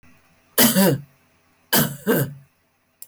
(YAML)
three_cough_length: 3.1 s
three_cough_amplitude: 20923
three_cough_signal_mean_std_ratio: 0.44
survey_phase: beta (2021-08-13 to 2022-03-07)
age: 65+
gender: Female
wearing_mask: 'No'
symptom_none: true
symptom_onset: 13 days
smoker_status: Never smoked
respiratory_condition_asthma: false
respiratory_condition_other: false
recruitment_source: REACT
submission_delay: 2 days
covid_test_result: Negative
covid_test_method: RT-qPCR
influenza_a_test_result: Negative
influenza_b_test_result: Negative